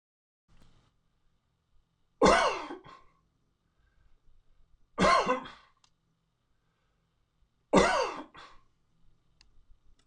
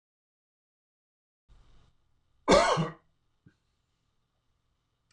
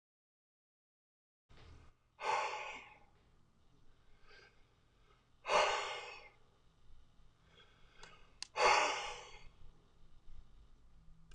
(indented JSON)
{
  "three_cough_length": "10.1 s",
  "three_cough_amplitude": 16137,
  "three_cough_signal_mean_std_ratio": 0.28,
  "cough_length": "5.1 s",
  "cough_amplitude": 12719,
  "cough_signal_mean_std_ratio": 0.22,
  "exhalation_length": "11.3 s",
  "exhalation_amplitude": 4254,
  "exhalation_signal_mean_std_ratio": 0.35,
  "survey_phase": "beta (2021-08-13 to 2022-03-07)",
  "age": "65+",
  "gender": "Male",
  "wearing_mask": "No",
  "symptom_none": true,
  "smoker_status": "Ex-smoker",
  "respiratory_condition_asthma": false,
  "respiratory_condition_other": false,
  "recruitment_source": "REACT",
  "submission_delay": "1 day",
  "covid_test_result": "Negative",
  "covid_test_method": "RT-qPCR"
}